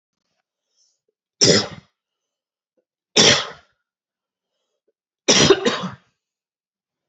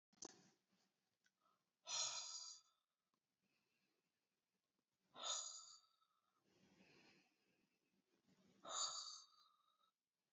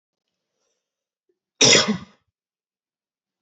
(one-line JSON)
{"three_cough_length": "7.1 s", "three_cough_amplitude": 32768, "three_cough_signal_mean_std_ratio": 0.29, "exhalation_length": "10.3 s", "exhalation_amplitude": 767, "exhalation_signal_mean_std_ratio": 0.34, "cough_length": "3.4 s", "cough_amplitude": 28086, "cough_signal_mean_std_ratio": 0.24, "survey_phase": "beta (2021-08-13 to 2022-03-07)", "age": "18-44", "gender": "Male", "wearing_mask": "No", "symptom_none": true, "smoker_status": "Never smoked", "respiratory_condition_asthma": false, "respiratory_condition_other": false, "recruitment_source": "REACT", "submission_delay": "5 days", "covid_test_result": "Negative", "covid_test_method": "RT-qPCR", "influenza_a_test_result": "Negative", "influenza_b_test_result": "Negative"}